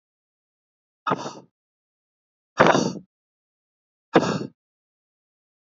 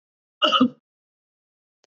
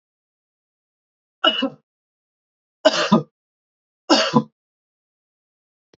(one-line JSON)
{"exhalation_length": "5.6 s", "exhalation_amplitude": 27535, "exhalation_signal_mean_std_ratio": 0.25, "cough_length": "1.9 s", "cough_amplitude": 18479, "cough_signal_mean_std_ratio": 0.3, "three_cough_length": "6.0 s", "three_cough_amplitude": 27558, "three_cough_signal_mean_std_ratio": 0.27, "survey_phase": "beta (2021-08-13 to 2022-03-07)", "age": "45-64", "gender": "Male", "wearing_mask": "No", "symptom_none": true, "smoker_status": "Never smoked", "respiratory_condition_asthma": false, "respiratory_condition_other": false, "recruitment_source": "REACT", "submission_delay": "3 days", "covid_test_result": "Negative", "covid_test_method": "RT-qPCR", "influenza_a_test_result": "Negative", "influenza_b_test_result": "Negative"}